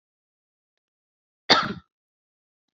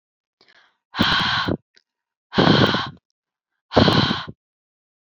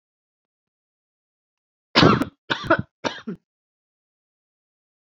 {
  "cough_length": "2.7 s",
  "cough_amplitude": 26100,
  "cough_signal_mean_std_ratio": 0.19,
  "exhalation_length": "5.0 s",
  "exhalation_amplitude": 32767,
  "exhalation_signal_mean_std_ratio": 0.44,
  "three_cough_length": "5.0 s",
  "three_cough_amplitude": 32767,
  "three_cough_signal_mean_std_ratio": 0.24,
  "survey_phase": "beta (2021-08-13 to 2022-03-07)",
  "age": "18-44",
  "gender": "Female",
  "wearing_mask": "No",
  "symptom_none": true,
  "smoker_status": "Never smoked",
  "respiratory_condition_asthma": false,
  "respiratory_condition_other": false,
  "recruitment_source": "REACT",
  "submission_delay": "1 day",
  "covid_test_result": "Negative",
  "covid_test_method": "RT-qPCR",
  "influenza_a_test_result": "Negative",
  "influenza_b_test_result": "Negative"
}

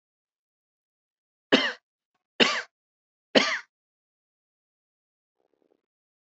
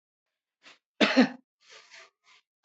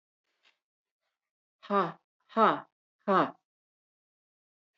{
  "three_cough_length": "6.3 s",
  "three_cough_amplitude": 24004,
  "three_cough_signal_mean_std_ratio": 0.22,
  "cough_length": "2.6 s",
  "cough_amplitude": 13886,
  "cough_signal_mean_std_ratio": 0.25,
  "exhalation_length": "4.8 s",
  "exhalation_amplitude": 10491,
  "exhalation_signal_mean_std_ratio": 0.27,
  "survey_phase": "beta (2021-08-13 to 2022-03-07)",
  "age": "65+",
  "gender": "Female",
  "wearing_mask": "No",
  "symptom_none": true,
  "smoker_status": "Never smoked",
  "respiratory_condition_asthma": false,
  "respiratory_condition_other": false,
  "recruitment_source": "REACT",
  "submission_delay": "4 days",
  "covid_test_result": "Negative",
  "covid_test_method": "RT-qPCR"
}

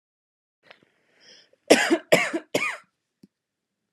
{
  "three_cough_length": "3.9 s",
  "three_cough_amplitude": 29664,
  "three_cough_signal_mean_std_ratio": 0.29,
  "survey_phase": "beta (2021-08-13 to 2022-03-07)",
  "age": "18-44",
  "gender": "Female",
  "wearing_mask": "No",
  "symptom_runny_or_blocked_nose": true,
  "symptom_sore_throat": true,
  "symptom_fatigue": true,
  "smoker_status": "Never smoked",
  "respiratory_condition_asthma": false,
  "respiratory_condition_other": false,
  "recruitment_source": "Test and Trace",
  "submission_delay": "2 days",
  "covid_test_result": "Positive",
  "covid_test_method": "LFT"
}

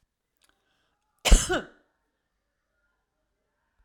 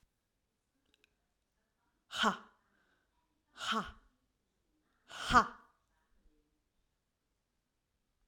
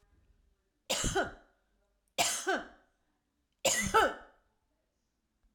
{
  "cough_length": "3.8 s",
  "cough_amplitude": 24395,
  "cough_signal_mean_std_ratio": 0.18,
  "exhalation_length": "8.3 s",
  "exhalation_amplitude": 7988,
  "exhalation_signal_mean_std_ratio": 0.21,
  "three_cough_length": "5.5 s",
  "three_cough_amplitude": 7198,
  "three_cough_signal_mean_std_ratio": 0.37,
  "survey_phase": "alpha (2021-03-01 to 2021-08-12)",
  "age": "45-64",
  "gender": "Female",
  "wearing_mask": "No",
  "symptom_none": true,
  "smoker_status": "Never smoked",
  "respiratory_condition_asthma": false,
  "respiratory_condition_other": false,
  "recruitment_source": "REACT",
  "submission_delay": "2 days",
  "covid_test_result": "Negative",
  "covid_test_method": "RT-qPCR"
}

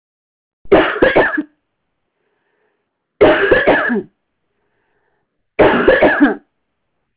{
  "three_cough_length": "7.2 s",
  "three_cough_amplitude": 32300,
  "three_cough_signal_mean_std_ratio": 0.45,
  "survey_phase": "alpha (2021-03-01 to 2021-08-12)",
  "age": "45-64",
  "gender": "Female",
  "wearing_mask": "Yes",
  "symptom_none": true,
  "smoker_status": "Never smoked",
  "respiratory_condition_asthma": false,
  "respiratory_condition_other": false,
  "recruitment_source": "REACT",
  "submission_delay": "7 days",
  "covid_test_result": "Negative",
  "covid_test_method": "RT-qPCR"
}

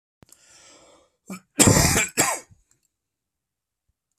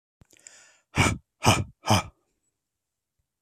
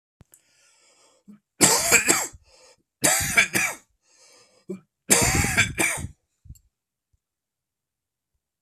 {
  "cough_length": "4.2 s",
  "cough_amplitude": 32768,
  "cough_signal_mean_std_ratio": 0.32,
  "exhalation_length": "3.4 s",
  "exhalation_amplitude": 22789,
  "exhalation_signal_mean_std_ratio": 0.31,
  "three_cough_length": "8.6 s",
  "three_cough_amplitude": 32767,
  "three_cough_signal_mean_std_ratio": 0.39,
  "survey_phase": "beta (2021-08-13 to 2022-03-07)",
  "age": "18-44",
  "gender": "Male",
  "wearing_mask": "No",
  "symptom_cough_any": true,
  "symptom_shortness_of_breath": true,
  "symptom_sore_throat": true,
  "symptom_fatigue": true,
  "symptom_headache": true,
  "symptom_onset": "4 days",
  "smoker_status": "Never smoked",
  "respiratory_condition_asthma": false,
  "respiratory_condition_other": false,
  "recruitment_source": "Test and Trace",
  "submission_delay": "1 day",
  "covid_test_result": "Negative",
  "covid_test_method": "RT-qPCR"
}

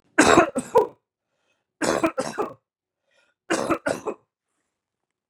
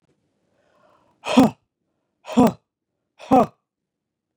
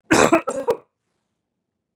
{
  "three_cough_length": "5.3 s",
  "three_cough_amplitude": 29512,
  "three_cough_signal_mean_std_ratio": 0.35,
  "exhalation_length": "4.4 s",
  "exhalation_amplitude": 29040,
  "exhalation_signal_mean_std_ratio": 0.26,
  "cough_length": "2.0 s",
  "cough_amplitude": 31751,
  "cough_signal_mean_std_ratio": 0.36,
  "survey_phase": "beta (2021-08-13 to 2022-03-07)",
  "age": "18-44",
  "gender": "Male",
  "wearing_mask": "No",
  "symptom_none": true,
  "smoker_status": "Never smoked",
  "respiratory_condition_asthma": false,
  "respiratory_condition_other": false,
  "recruitment_source": "REACT",
  "submission_delay": "2 days",
  "covid_test_result": "Negative",
  "covid_test_method": "RT-qPCR",
  "influenza_a_test_result": "Negative",
  "influenza_b_test_result": "Negative"
}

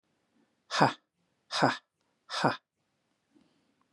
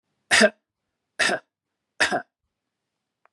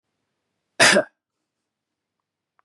{
  "exhalation_length": "3.9 s",
  "exhalation_amplitude": 15689,
  "exhalation_signal_mean_std_ratio": 0.28,
  "three_cough_length": "3.3 s",
  "three_cough_amplitude": 24369,
  "three_cough_signal_mean_std_ratio": 0.3,
  "cough_length": "2.6 s",
  "cough_amplitude": 28152,
  "cough_signal_mean_std_ratio": 0.23,
  "survey_phase": "beta (2021-08-13 to 2022-03-07)",
  "age": "45-64",
  "gender": "Male",
  "wearing_mask": "No",
  "symptom_none": true,
  "smoker_status": "Ex-smoker",
  "respiratory_condition_asthma": false,
  "respiratory_condition_other": false,
  "recruitment_source": "REACT",
  "submission_delay": "2 days",
  "covid_test_result": "Negative",
  "covid_test_method": "RT-qPCR",
  "influenza_a_test_result": "Negative",
  "influenza_b_test_result": "Negative"
}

